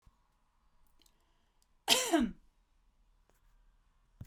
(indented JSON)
{
  "cough_length": "4.3 s",
  "cough_amplitude": 8701,
  "cough_signal_mean_std_ratio": 0.26,
  "survey_phase": "beta (2021-08-13 to 2022-03-07)",
  "age": "18-44",
  "gender": "Female",
  "wearing_mask": "No",
  "symptom_cough_any": true,
  "symptom_sore_throat": true,
  "symptom_fatigue": true,
  "symptom_onset": "3 days",
  "smoker_status": "Never smoked",
  "respiratory_condition_asthma": false,
  "respiratory_condition_other": false,
  "recruitment_source": "Test and Trace",
  "submission_delay": "2 days",
  "covid_test_result": "Positive",
  "covid_test_method": "RT-qPCR"
}